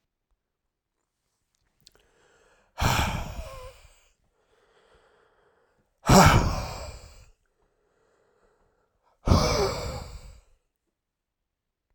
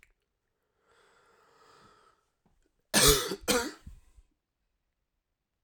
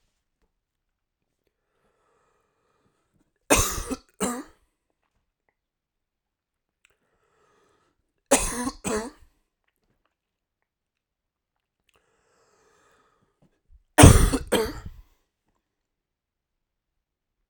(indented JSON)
{
  "exhalation_length": "11.9 s",
  "exhalation_amplitude": 22888,
  "exhalation_signal_mean_std_ratio": 0.29,
  "cough_length": "5.6 s",
  "cough_amplitude": 12952,
  "cough_signal_mean_std_ratio": 0.25,
  "three_cough_length": "17.5 s",
  "three_cough_amplitude": 32768,
  "three_cough_signal_mean_std_ratio": 0.19,
  "survey_phase": "alpha (2021-03-01 to 2021-08-12)",
  "age": "18-44",
  "gender": "Male",
  "wearing_mask": "No",
  "symptom_none": true,
  "smoker_status": "Never smoked",
  "respiratory_condition_asthma": true,
  "respiratory_condition_other": false,
  "recruitment_source": "REACT",
  "submission_delay": "1 day",
  "covid_test_result": "Negative",
  "covid_test_method": "RT-qPCR"
}